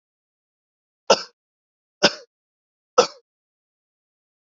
{"three_cough_length": "4.4 s", "three_cough_amplitude": 29511, "three_cough_signal_mean_std_ratio": 0.17, "survey_phase": "beta (2021-08-13 to 2022-03-07)", "age": "18-44", "gender": "Male", "wearing_mask": "No", "symptom_none": true, "smoker_status": "Never smoked", "respiratory_condition_asthma": false, "respiratory_condition_other": false, "recruitment_source": "Test and Trace", "submission_delay": "2 days", "covid_test_result": "Positive", "covid_test_method": "RT-qPCR", "covid_ct_value": 26.1, "covid_ct_gene": "S gene", "covid_ct_mean": 26.5, "covid_viral_load": "2100 copies/ml", "covid_viral_load_category": "Minimal viral load (< 10K copies/ml)"}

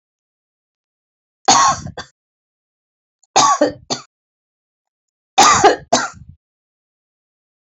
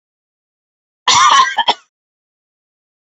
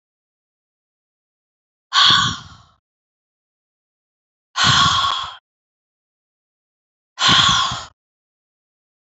{"three_cough_length": "7.7 s", "three_cough_amplitude": 32768, "three_cough_signal_mean_std_ratio": 0.32, "cough_length": "3.2 s", "cough_amplitude": 31174, "cough_signal_mean_std_ratio": 0.36, "exhalation_length": "9.1 s", "exhalation_amplitude": 28816, "exhalation_signal_mean_std_ratio": 0.34, "survey_phase": "alpha (2021-03-01 to 2021-08-12)", "age": "65+", "gender": "Female", "wearing_mask": "No", "symptom_none": true, "smoker_status": "Ex-smoker", "respiratory_condition_asthma": false, "respiratory_condition_other": false, "recruitment_source": "REACT", "submission_delay": "1 day", "covid_test_result": "Negative", "covid_test_method": "RT-qPCR"}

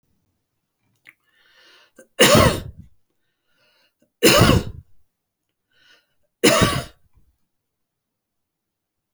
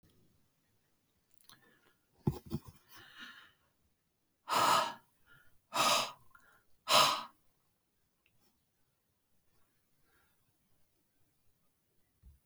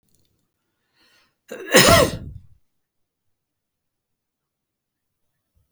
{"three_cough_length": "9.1 s", "three_cough_amplitude": 32767, "three_cough_signal_mean_std_ratio": 0.29, "exhalation_length": "12.5 s", "exhalation_amplitude": 8087, "exhalation_signal_mean_std_ratio": 0.26, "cough_length": "5.7 s", "cough_amplitude": 32768, "cough_signal_mean_std_ratio": 0.22, "survey_phase": "beta (2021-08-13 to 2022-03-07)", "age": "65+", "gender": "Male", "wearing_mask": "No", "symptom_abdominal_pain": true, "symptom_fatigue": true, "symptom_fever_high_temperature": true, "symptom_headache": true, "symptom_change_to_sense_of_smell_or_taste": true, "symptom_loss_of_taste": true, "smoker_status": "Ex-smoker", "respiratory_condition_asthma": false, "respiratory_condition_other": false, "recruitment_source": "Test and Trace", "submission_delay": "2 days", "covid_test_result": "Positive", "covid_test_method": "RT-qPCR"}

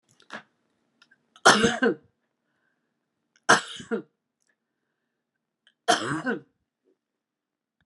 {"three_cough_length": "7.9 s", "three_cough_amplitude": 26794, "three_cough_signal_mean_std_ratio": 0.26, "survey_phase": "beta (2021-08-13 to 2022-03-07)", "age": "65+", "gender": "Female", "wearing_mask": "No", "symptom_cough_any": true, "symptom_shortness_of_breath": true, "symptom_fatigue": true, "symptom_onset": "5 days", "smoker_status": "Never smoked", "respiratory_condition_asthma": false, "respiratory_condition_other": false, "recruitment_source": "REACT", "submission_delay": "1 day", "covid_test_result": "Negative", "covid_test_method": "RT-qPCR"}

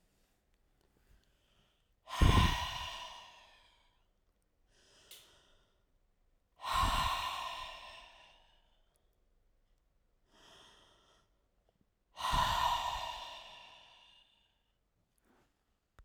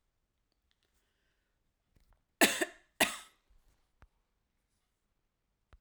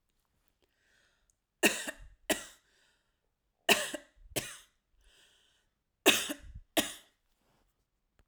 {"exhalation_length": "16.0 s", "exhalation_amplitude": 7035, "exhalation_signal_mean_std_ratio": 0.33, "cough_length": "5.8 s", "cough_amplitude": 10448, "cough_signal_mean_std_ratio": 0.17, "three_cough_length": "8.3 s", "three_cough_amplitude": 12556, "three_cough_signal_mean_std_ratio": 0.25, "survey_phase": "alpha (2021-03-01 to 2021-08-12)", "age": "45-64", "gender": "Female", "wearing_mask": "No", "symptom_none": true, "smoker_status": "Never smoked", "respiratory_condition_asthma": false, "respiratory_condition_other": false, "recruitment_source": "REACT", "submission_delay": "2 days", "covid_test_result": "Negative", "covid_test_method": "RT-qPCR"}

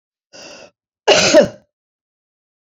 {"cough_length": "2.7 s", "cough_amplitude": 29860, "cough_signal_mean_std_ratio": 0.32, "survey_phase": "beta (2021-08-13 to 2022-03-07)", "age": "65+", "gender": "Female", "wearing_mask": "No", "symptom_none": true, "smoker_status": "Ex-smoker", "respiratory_condition_asthma": false, "respiratory_condition_other": false, "recruitment_source": "REACT", "submission_delay": "2 days", "covid_test_result": "Negative", "covid_test_method": "RT-qPCR"}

